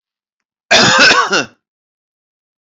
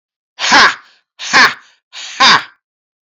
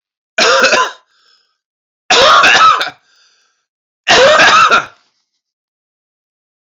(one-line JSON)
{"cough_length": "2.6 s", "cough_amplitude": 32463, "cough_signal_mean_std_ratio": 0.44, "exhalation_length": "3.2 s", "exhalation_amplitude": 32748, "exhalation_signal_mean_std_ratio": 0.45, "three_cough_length": "6.7 s", "three_cough_amplitude": 32024, "three_cough_signal_mean_std_ratio": 0.51, "survey_phase": "beta (2021-08-13 to 2022-03-07)", "age": "45-64", "gender": "Male", "wearing_mask": "No", "symptom_none": true, "smoker_status": "Never smoked", "respiratory_condition_asthma": false, "respiratory_condition_other": false, "recruitment_source": "REACT", "submission_delay": "1 day", "covid_test_result": "Negative", "covid_test_method": "RT-qPCR"}